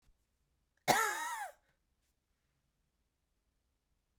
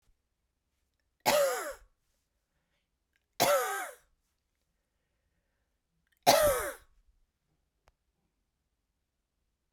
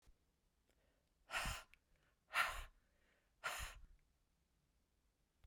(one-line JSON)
{"cough_length": "4.2 s", "cough_amplitude": 7340, "cough_signal_mean_std_ratio": 0.27, "three_cough_length": "9.7 s", "three_cough_amplitude": 15849, "three_cough_signal_mean_std_ratio": 0.28, "exhalation_length": "5.5 s", "exhalation_amplitude": 1888, "exhalation_signal_mean_std_ratio": 0.33, "survey_phase": "beta (2021-08-13 to 2022-03-07)", "age": "18-44", "gender": "Female", "wearing_mask": "No", "symptom_cough_any": true, "symptom_new_continuous_cough": true, "symptom_runny_or_blocked_nose": true, "symptom_fatigue": true, "symptom_headache": true, "symptom_change_to_sense_of_smell_or_taste": true, "symptom_loss_of_taste": true, "smoker_status": "Ex-smoker", "respiratory_condition_asthma": false, "respiratory_condition_other": false, "recruitment_source": "Test and Trace", "submission_delay": "0 days", "covid_test_result": "Positive", "covid_test_method": "LFT"}